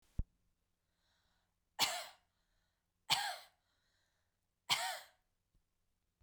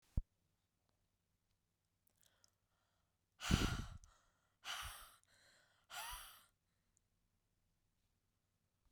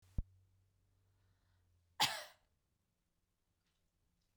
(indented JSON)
{
  "three_cough_length": "6.2 s",
  "three_cough_amplitude": 4701,
  "three_cough_signal_mean_std_ratio": 0.27,
  "exhalation_length": "8.9 s",
  "exhalation_amplitude": 3520,
  "exhalation_signal_mean_std_ratio": 0.24,
  "cough_length": "4.4 s",
  "cough_amplitude": 3210,
  "cough_signal_mean_std_ratio": 0.19,
  "survey_phase": "beta (2021-08-13 to 2022-03-07)",
  "age": "18-44",
  "gender": "Female",
  "wearing_mask": "No",
  "symptom_cough_any": true,
  "symptom_runny_or_blocked_nose": true,
  "symptom_sore_throat": true,
  "symptom_headache": true,
  "smoker_status": "Never smoked",
  "respiratory_condition_asthma": false,
  "respiratory_condition_other": false,
  "recruitment_source": "Test and Trace",
  "submission_delay": "2 days",
  "covid_test_result": "Positive",
  "covid_test_method": "LAMP"
}